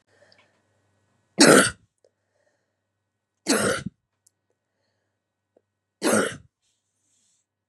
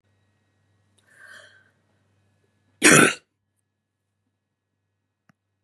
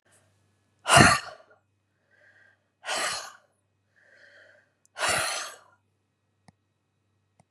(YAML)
three_cough_length: 7.7 s
three_cough_amplitude: 29091
three_cough_signal_mean_std_ratio: 0.25
cough_length: 5.6 s
cough_amplitude: 31706
cough_signal_mean_std_ratio: 0.18
exhalation_length: 7.5 s
exhalation_amplitude: 28851
exhalation_signal_mean_std_ratio: 0.26
survey_phase: beta (2021-08-13 to 2022-03-07)
age: 65+
gender: Female
wearing_mask: 'No'
symptom_none: true
smoker_status: Ex-smoker
respiratory_condition_asthma: false
respiratory_condition_other: true
recruitment_source: REACT
submission_delay: 2 days
covid_test_result: Negative
covid_test_method: RT-qPCR
influenza_a_test_result: Negative
influenza_b_test_result: Negative